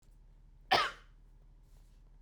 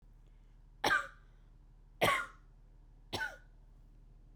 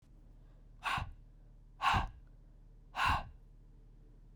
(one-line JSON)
{"cough_length": "2.2 s", "cough_amplitude": 5745, "cough_signal_mean_std_ratio": 0.31, "three_cough_length": "4.4 s", "three_cough_amplitude": 5308, "three_cough_signal_mean_std_ratio": 0.38, "exhalation_length": "4.4 s", "exhalation_amplitude": 3923, "exhalation_signal_mean_std_ratio": 0.45, "survey_phase": "beta (2021-08-13 to 2022-03-07)", "age": "18-44", "gender": "Female", "wearing_mask": "No", "symptom_cough_any": true, "symptom_runny_or_blocked_nose": true, "symptom_sore_throat": true, "symptom_fatigue": true, "symptom_headache": true, "symptom_onset": "3 days", "smoker_status": "Never smoked", "respiratory_condition_asthma": false, "respiratory_condition_other": false, "recruitment_source": "Test and Trace", "submission_delay": "1 day", "covid_test_result": "Positive", "covid_test_method": "ePCR"}